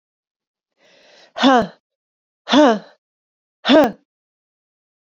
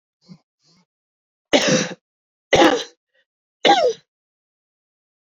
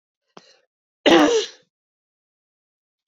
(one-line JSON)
{"exhalation_length": "5.0 s", "exhalation_amplitude": 29525, "exhalation_signal_mean_std_ratio": 0.32, "three_cough_length": "5.2 s", "three_cough_amplitude": 27211, "three_cough_signal_mean_std_ratio": 0.33, "cough_length": "3.1 s", "cough_amplitude": 26168, "cough_signal_mean_std_ratio": 0.29, "survey_phase": "beta (2021-08-13 to 2022-03-07)", "age": "45-64", "gender": "Female", "wearing_mask": "No", "symptom_cough_any": true, "symptom_fatigue": true, "smoker_status": "Never smoked", "respiratory_condition_asthma": false, "respiratory_condition_other": false, "recruitment_source": "Test and Trace", "submission_delay": "2 days", "covid_test_result": "Positive", "covid_test_method": "LFT"}